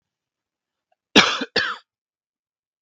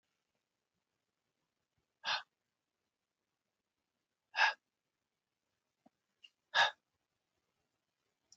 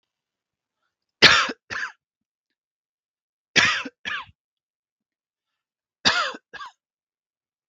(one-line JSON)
{"cough_length": "2.8 s", "cough_amplitude": 32768, "cough_signal_mean_std_ratio": 0.26, "exhalation_length": "8.4 s", "exhalation_amplitude": 5324, "exhalation_signal_mean_std_ratio": 0.18, "three_cough_length": "7.7 s", "three_cough_amplitude": 32768, "three_cough_signal_mean_std_ratio": 0.25, "survey_phase": "beta (2021-08-13 to 2022-03-07)", "age": "18-44", "gender": "Male", "wearing_mask": "No", "symptom_none": true, "smoker_status": "Never smoked", "respiratory_condition_asthma": false, "respiratory_condition_other": false, "recruitment_source": "REACT", "submission_delay": "1 day", "covid_test_result": "Negative", "covid_test_method": "RT-qPCR", "influenza_a_test_result": "Unknown/Void", "influenza_b_test_result": "Unknown/Void"}